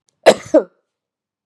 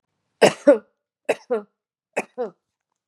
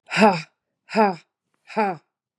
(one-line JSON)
{"cough_length": "1.5 s", "cough_amplitude": 32768, "cough_signal_mean_std_ratio": 0.26, "three_cough_length": "3.1 s", "three_cough_amplitude": 28060, "three_cough_signal_mean_std_ratio": 0.27, "exhalation_length": "2.4 s", "exhalation_amplitude": 28342, "exhalation_signal_mean_std_ratio": 0.39, "survey_phase": "beta (2021-08-13 to 2022-03-07)", "age": "45-64", "gender": "Female", "wearing_mask": "No", "symptom_runny_or_blocked_nose": true, "symptom_sore_throat": true, "symptom_fatigue": true, "smoker_status": "Never smoked", "respiratory_condition_asthma": false, "respiratory_condition_other": false, "recruitment_source": "Test and Trace", "submission_delay": "1 day", "covid_test_result": "Positive", "covid_test_method": "LFT"}